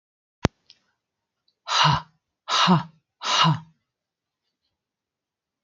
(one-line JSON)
{"exhalation_length": "5.6 s", "exhalation_amplitude": 32767, "exhalation_signal_mean_std_ratio": 0.34, "survey_phase": "beta (2021-08-13 to 2022-03-07)", "age": "18-44", "gender": "Female", "wearing_mask": "No", "symptom_none": true, "smoker_status": "Never smoked", "respiratory_condition_asthma": false, "respiratory_condition_other": false, "recruitment_source": "REACT", "submission_delay": "4 days", "covid_test_result": "Negative", "covid_test_method": "RT-qPCR", "influenza_a_test_result": "Negative", "influenza_b_test_result": "Negative"}